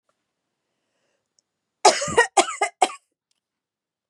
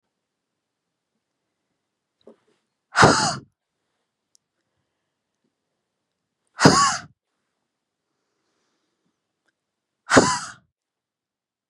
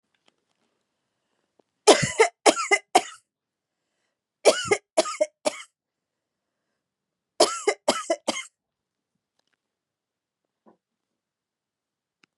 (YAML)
cough_length: 4.1 s
cough_amplitude: 28581
cough_signal_mean_std_ratio: 0.26
exhalation_length: 11.7 s
exhalation_amplitude: 32767
exhalation_signal_mean_std_ratio: 0.22
three_cough_length: 12.4 s
three_cough_amplitude: 32393
three_cough_signal_mean_std_ratio: 0.24
survey_phase: beta (2021-08-13 to 2022-03-07)
age: 45-64
gender: Female
wearing_mask: 'No'
symptom_fatigue: true
smoker_status: Ex-smoker
respiratory_condition_asthma: false
respiratory_condition_other: false
recruitment_source: REACT
submission_delay: 2 days
covid_test_result: Negative
covid_test_method: RT-qPCR
influenza_a_test_result: Negative
influenza_b_test_result: Negative